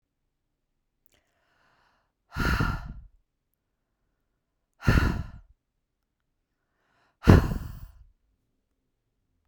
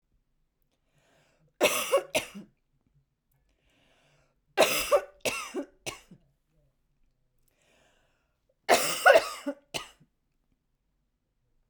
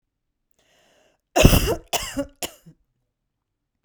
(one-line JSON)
{"exhalation_length": "9.5 s", "exhalation_amplitude": 29463, "exhalation_signal_mean_std_ratio": 0.24, "three_cough_length": "11.7 s", "three_cough_amplitude": 16684, "three_cough_signal_mean_std_ratio": 0.28, "cough_length": "3.8 s", "cough_amplitude": 32768, "cough_signal_mean_std_ratio": 0.28, "survey_phase": "beta (2021-08-13 to 2022-03-07)", "age": "45-64", "gender": "Female", "wearing_mask": "No", "symptom_sore_throat": true, "symptom_fatigue": true, "smoker_status": "Ex-smoker", "respiratory_condition_asthma": false, "respiratory_condition_other": false, "recruitment_source": "Test and Trace", "submission_delay": "2 days", "covid_test_result": "Positive", "covid_test_method": "RT-qPCR", "covid_ct_value": 25.4, "covid_ct_gene": "ORF1ab gene"}